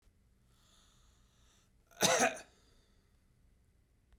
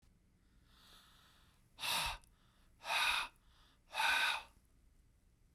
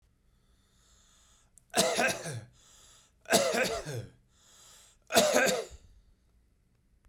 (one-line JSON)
{"cough_length": "4.2 s", "cough_amplitude": 7086, "cough_signal_mean_std_ratio": 0.25, "exhalation_length": "5.5 s", "exhalation_amplitude": 2448, "exhalation_signal_mean_std_ratio": 0.42, "three_cough_length": "7.1 s", "three_cough_amplitude": 12091, "three_cough_signal_mean_std_ratio": 0.4, "survey_phase": "beta (2021-08-13 to 2022-03-07)", "age": "45-64", "gender": "Male", "wearing_mask": "No", "symptom_none": true, "smoker_status": "Never smoked", "respiratory_condition_asthma": false, "respiratory_condition_other": false, "recruitment_source": "REACT", "submission_delay": "1 day", "covid_test_result": "Negative", "covid_test_method": "RT-qPCR"}